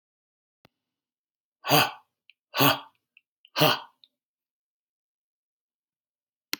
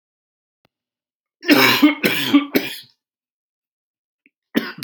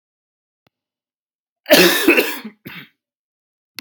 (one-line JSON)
{"exhalation_length": "6.6 s", "exhalation_amplitude": 18799, "exhalation_signal_mean_std_ratio": 0.24, "three_cough_length": "4.8 s", "three_cough_amplitude": 31152, "three_cough_signal_mean_std_ratio": 0.37, "cough_length": "3.8 s", "cough_amplitude": 32768, "cough_signal_mean_std_ratio": 0.32, "survey_phase": "beta (2021-08-13 to 2022-03-07)", "age": "18-44", "gender": "Male", "wearing_mask": "No", "symptom_cough_any": true, "symptom_shortness_of_breath": true, "symptom_fatigue": true, "symptom_fever_high_temperature": true, "symptom_headache": true, "symptom_change_to_sense_of_smell_or_taste": true, "symptom_other": true, "symptom_onset": "5 days", "smoker_status": "Ex-smoker", "respiratory_condition_asthma": false, "respiratory_condition_other": false, "recruitment_source": "Test and Trace", "submission_delay": "3 days", "covid_test_result": "Positive", "covid_test_method": "RT-qPCR"}